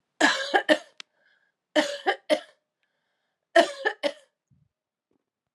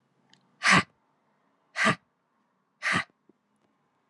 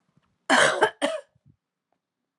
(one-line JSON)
{"three_cough_length": "5.5 s", "three_cough_amplitude": 23097, "three_cough_signal_mean_std_ratio": 0.32, "exhalation_length": "4.1 s", "exhalation_amplitude": 14111, "exhalation_signal_mean_std_ratio": 0.28, "cough_length": "2.4 s", "cough_amplitude": 19303, "cough_signal_mean_std_ratio": 0.36, "survey_phase": "alpha (2021-03-01 to 2021-08-12)", "age": "45-64", "gender": "Female", "wearing_mask": "No", "symptom_cough_any": true, "symptom_fatigue": true, "symptom_change_to_sense_of_smell_or_taste": true, "symptom_loss_of_taste": true, "symptom_onset": "3 days", "smoker_status": "Never smoked", "respiratory_condition_asthma": false, "respiratory_condition_other": false, "recruitment_source": "Test and Trace", "submission_delay": "1 day", "covid_test_result": "Positive", "covid_test_method": "RT-qPCR", "covid_ct_value": 13.7, "covid_ct_gene": "ORF1ab gene", "covid_ct_mean": 13.9, "covid_viral_load": "27000000 copies/ml", "covid_viral_load_category": "High viral load (>1M copies/ml)"}